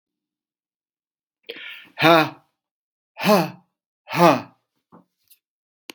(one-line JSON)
{"exhalation_length": "5.9 s", "exhalation_amplitude": 32767, "exhalation_signal_mean_std_ratio": 0.28, "survey_phase": "beta (2021-08-13 to 2022-03-07)", "age": "65+", "gender": "Male", "wearing_mask": "No", "symptom_cough_any": true, "smoker_status": "Ex-smoker", "respiratory_condition_asthma": false, "respiratory_condition_other": false, "recruitment_source": "REACT", "submission_delay": "1 day", "covid_test_result": "Negative", "covid_test_method": "RT-qPCR", "influenza_a_test_result": "Negative", "influenza_b_test_result": "Negative"}